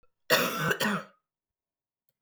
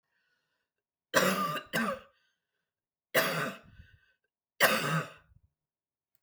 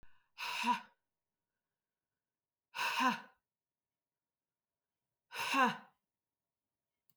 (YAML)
cough_length: 2.2 s
cough_amplitude: 9985
cough_signal_mean_std_ratio: 0.44
three_cough_length: 6.2 s
three_cough_amplitude: 9753
three_cough_signal_mean_std_ratio: 0.39
exhalation_length: 7.2 s
exhalation_amplitude: 3510
exhalation_signal_mean_std_ratio: 0.32
survey_phase: beta (2021-08-13 to 2022-03-07)
age: 45-64
gender: Female
wearing_mask: 'No'
symptom_cough_any: true
symptom_runny_or_blocked_nose: true
symptom_sore_throat: true
symptom_fatigue: true
symptom_onset: 3 days
smoker_status: Ex-smoker
respiratory_condition_asthma: false
respiratory_condition_other: false
recruitment_source: Test and Trace
submission_delay: 2 days
covid_test_result: Positive
covid_test_method: RT-qPCR
covid_ct_value: 27.4
covid_ct_gene: ORF1ab gene
covid_ct_mean: 28.1
covid_viral_load: 620 copies/ml
covid_viral_load_category: Minimal viral load (< 10K copies/ml)